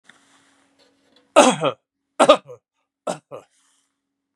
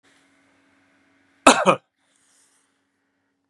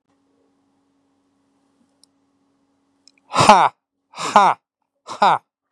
three_cough_length: 4.4 s
three_cough_amplitude: 32767
three_cough_signal_mean_std_ratio: 0.25
cough_length: 3.5 s
cough_amplitude: 32768
cough_signal_mean_std_ratio: 0.19
exhalation_length: 5.7 s
exhalation_amplitude: 32768
exhalation_signal_mean_std_ratio: 0.27
survey_phase: beta (2021-08-13 to 2022-03-07)
age: 65+
gender: Male
wearing_mask: 'No'
symptom_diarrhoea: true
symptom_headache: true
symptom_onset: 12 days
smoker_status: Ex-smoker
respiratory_condition_asthma: false
respiratory_condition_other: false
recruitment_source: REACT
submission_delay: 4 days
covid_test_result: Negative
covid_test_method: RT-qPCR
influenza_a_test_result: Negative
influenza_b_test_result: Negative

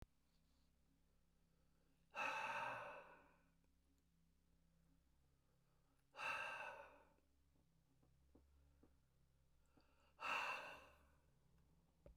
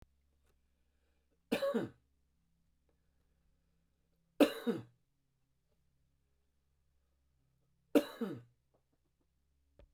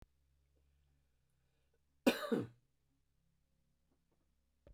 exhalation_length: 12.2 s
exhalation_amplitude: 736
exhalation_signal_mean_std_ratio: 0.4
three_cough_length: 9.9 s
three_cough_amplitude: 6831
three_cough_signal_mean_std_ratio: 0.21
cough_length: 4.7 s
cough_amplitude: 4307
cough_signal_mean_std_ratio: 0.19
survey_phase: beta (2021-08-13 to 2022-03-07)
age: 65+
gender: Male
wearing_mask: 'No'
symptom_none: true
smoker_status: Ex-smoker
respiratory_condition_asthma: true
respiratory_condition_other: false
recruitment_source: REACT
submission_delay: 2 days
covid_test_result: Negative
covid_test_method: RT-qPCR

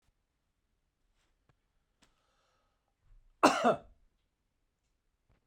cough_length: 5.5 s
cough_amplitude: 11787
cough_signal_mean_std_ratio: 0.18
survey_phase: beta (2021-08-13 to 2022-03-07)
age: 45-64
gender: Male
wearing_mask: 'No'
symptom_fatigue: true
symptom_headache: true
smoker_status: Never smoked
respiratory_condition_asthma: false
respiratory_condition_other: false
recruitment_source: REACT
submission_delay: 2 days
covid_test_result: Negative
covid_test_method: RT-qPCR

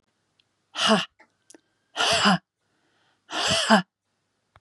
exhalation_length: 4.6 s
exhalation_amplitude: 23333
exhalation_signal_mean_std_ratio: 0.39
survey_phase: beta (2021-08-13 to 2022-03-07)
age: 45-64
gender: Female
wearing_mask: 'No'
symptom_none: true
smoker_status: Never smoked
respiratory_condition_asthma: false
respiratory_condition_other: false
recruitment_source: REACT
submission_delay: 1 day
covid_test_result: Negative
covid_test_method: RT-qPCR
influenza_a_test_result: Negative
influenza_b_test_result: Negative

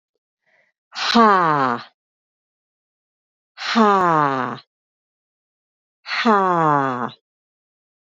exhalation_length: 8.0 s
exhalation_amplitude: 27001
exhalation_signal_mean_std_ratio: 0.42
survey_phase: beta (2021-08-13 to 2022-03-07)
age: 45-64
gender: Female
wearing_mask: 'No'
symptom_cough_any: true
symptom_runny_or_blocked_nose: true
symptom_shortness_of_breath: true
symptom_sore_throat: true
symptom_fatigue: true
symptom_fever_high_temperature: true
symptom_headache: true
symptom_other: true
symptom_onset: 4 days
smoker_status: Never smoked
respiratory_condition_asthma: true
respiratory_condition_other: false
recruitment_source: Test and Trace
submission_delay: 2 days
covid_test_result: Positive
covid_test_method: RT-qPCR
covid_ct_value: 22.5
covid_ct_gene: ORF1ab gene
covid_ct_mean: 23.1
covid_viral_load: 26000 copies/ml
covid_viral_load_category: Low viral load (10K-1M copies/ml)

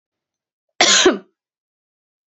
cough_length: 2.3 s
cough_amplitude: 31665
cough_signal_mean_std_ratio: 0.31
survey_phase: beta (2021-08-13 to 2022-03-07)
age: 45-64
gender: Female
wearing_mask: 'No'
symptom_cough_any: true
symptom_runny_or_blocked_nose: true
symptom_shortness_of_breath: true
symptom_sore_throat: true
symptom_fatigue: true
symptom_headache: true
smoker_status: Never smoked
respiratory_condition_asthma: false
respiratory_condition_other: false
recruitment_source: Test and Trace
submission_delay: 1 day
covid_test_result: Positive
covid_test_method: RT-qPCR
covid_ct_value: 22.1
covid_ct_gene: N gene
covid_ct_mean: 22.7
covid_viral_load: 35000 copies/ml
covid_viral_load_category: Low viral load (10K-1M copies/ml)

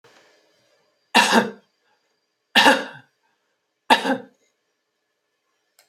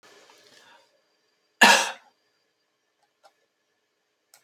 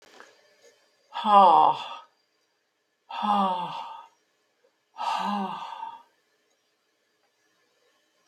three_cough_length: 5.9 s
three_cough_amplitude: 29762
three_cough_signal_mean_std_ratio: 0.28
cough_length: 4.4 s
cough_amplitude: 31695
cough_signal_mean_std_ratio: 0.19
exhalation_length: 8.3 s
exhalation_amplitude: 18858
exhalation_signal_mean_std_ratio: 0.35
survey_phase: beta (2021-08-13 to 2022-03-07)
age: 65+
gender: Female
wearing_mask: 'No'
symptom_none: true
smoker_status: Never smoked
respiratory_condition_asthma: false
respiratory_condition_other: true
recruitment_source: REACT
submission_delay: 5 days
covid_test_result: Negative
covid_test_method: RT-qPCR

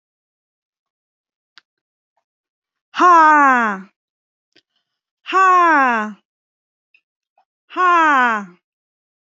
exhalation_length: 9.2 s
exhalation_amplitude: 26968
exhalation_signal_mean_std_ratio: 0.39
survey_phase: alpha (2021-03-01 to 2021-08-12)
age: 18-44
gender: Female
wearing_mask: 'No'
symptom_none: true
symptom_onset: 12 days
smoker_status: Never smoked
respiratory_condition_asthma: false
respiratory_condition_other: false
recruitment_source: REACT
submission_delay: 2 days
covid_test_result: Negative
covid_test_method: RT-qPCR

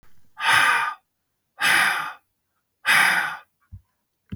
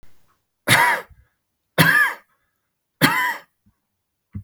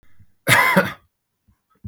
exhalation_length: 4.4 s
exhalation_amplitude: 18405
exhalation_signal_mean_std_ratio: 0.5
three_cough_length: 4.4 s
three_cough_amplitude: 32768
three_cough_signal_mean_std_ratio: 0.39
cough_length: 1.9 s
cough_amplitude: 32768
cough_signal_mean_std_ratio: 0.39
survey_phase: beta (2021-08-13 to 2022-03-07)
age: 45-64
gender: Male
wearing_mask: 'No'
symptom_none: true
smoker_status: Never smoked
respiratory_condition_asthma: false
respiratory_condition_other: false
recruitment_source: REACT
submission_delay: 9 days
covid_test_result: Negative
covid_test_method: RT-qPCR
influenza_a_test_result: Negative
influenza_b_test_result: Negative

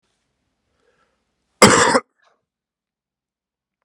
cough_length: 3.8 s
cough_amplitude: 32768
cough_signal_mean_std_ratio: 0.23
survey_phase: beta (2021-08-13 to 2022-03-07)
age: 18-44
gender: Male
wearing_mask: 'No'
symptom_cough_any: true
symptom_runny_or_blocked_nose: true
symptom_sore_throat: true
symptom_fatigue: true
symptom_fever_high_temperature: true
symptom_headache: true
symptom_loss_of_taste: true
symptom_onset: 7 days
smoker_status: Never smoked
respiratory_condition_asthma: false
respiratory_condition_other: false
recruitment_source: Test and Trace
submission_delay: 5 days
covid_test_result: Positive
covid_test_method: RT-qPCR
covid_ct_value: 13.8
covid_ct_gene: ORF1ab gene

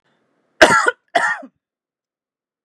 cough_length: 2.6 s
cough_amplitude: 32768
cough_signal_mean_std_ratio: 0.31
survey_phase: beta (2021-08-13 to 2022-03-07)
age: 65+
gender: Female
wearing_mask: 'No'
symptom_none: true
symptom_onset: 9 days
smoker_status: Ex-smoker
respiratory_condition_asthma: false
respiratory_condition_other: false
recruitment_source: REACT
submission_delay: 2 days
covid_test_result: Negative
covid_test_method: RT-qPCR
influenza_a_test_result: Unknown/Void
influenza_b_test_result: Unknown/Void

